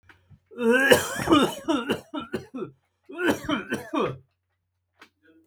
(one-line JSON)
{"cough_length": "5.5 s", "cough_amplitude": 29566, "cough_signal_mean_std_ratio": 0.48, "survey_phase": "beta (2021-08-13 to 2022-03-07)", "age": "45-64", "gender": "Male", "wearing_mask": "No", "symptom_none": true, "smoker_status": "Never smoked", "respiratory_condition_asthma": false, "respiratory_condition_other": false, "recruitment_source": "REACT", "submission_delay": "0 days", "covid_test_result": "Negative", "covid_test_method": "RT-qPCR"}